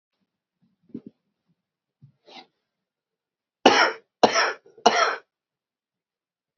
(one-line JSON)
{"three_cough_length": "6.6 s", "three_cough_amplitude": 30288, "three_cough_signal_mean_std_ratio": 0.26, "survey_phase": "alpha (2021-03-01 to 2021-08-12)", "age": "45-64", "gender": "Male", "wearing_mask": "No", "symptom_cough_any": true, "symptom_fatigue": true, "symptom_fever_high_temperature": true, "symptom_headache": true, "smoker_status": "Ex-smoker", "respiratory_condition_asthma": true, "respiratory_condition_other": false, "recruitment_source": "Test and Trace", "submission_delay": "1 day", "covid_test_result": "Positive", "covid_test_method": "RT-qPCR", "covid_ct_value": 13.3, "covid_ct_gene": "ORF1ab gene", "covid_ct_mean": 13.8, "covid_viral_load": "30000000 copies/ml", "covid_viral_load_category": "High viral load (>1M copies/ml)"}